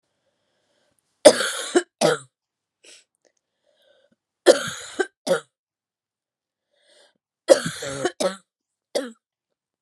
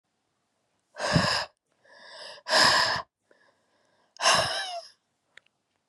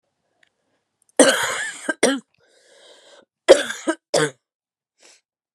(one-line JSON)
{"three_cough_length": "9.8 s", "three_cough_amplitude": 32768, "three_cough_signal_mean_std_ratio": 0.25, "exhalation_length": "5.9 s", "exhalation_amplitude": 15449, "exhalation_signal_mean_std_ratio": 0.41, "cough_length": "5.5 s", "cough_amplitude": 32768, "cough_signal_mean_std_ratio": 0.3, "survey_phase": "beta (2021-08-13 to 2022-03-07)", "age": "45-64", "gender": "Female", "wearing_mask": "No", "symptom_cough_any": true, "symptom_runny_or_blocked_nose": true, "symptom_fatigue": true, "symptom_headache": true, "symptom_change_to_sense_of_smell_or_taste": true, "symptom_other": true, "smoker_status": "Never smoked", "respiratory_condition_asthma": false, "respiratory_condition_other": false, "recruitment_source": "Test and Trace", "submission_delay": "2 days", "covid_test_result": "Positive", "covid_test_method": "RT-qPCR", "covid_ct_value": 21.8, "covid_ct_gene": "ORF1ab gene"}